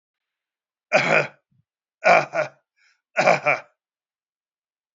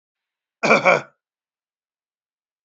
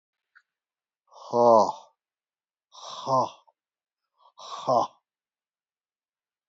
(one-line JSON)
{"three_cough_length": "4.9 s", "three_cough_amplitude": 30755, "three_cough_signal_mean_std_ratio": 0.34, "cough_length": "2.6 s", "cough_amplitude": 27030, "cough_signal_mean_std_ratio": 0.27, "exhalation_length": "6.5 s", "exhalation_amplitude": 18736, "exhalation_signal_mean_std_ratio": 0.28, "survey_phase": "beta (2021-08-13 to 2022-03-07)", "age": "65+", "gender": "Male", "wearing_mask": "No", "symptom_cough_any": true, "symptom_sore_throat": true, "symptom_onset": "3 days", "smoker_status": "Never smoked", "respiratory_condition_asthma": false, "respiratory_condition_other": false, "recruitment_source": "Test and Trace", "submission_delay": "1 day", "covid_test_result": "Positive", "covid_test_method": "RT-qPCR", "covid_ct_value": 25.0, "covid_ct_gene": "N gene"}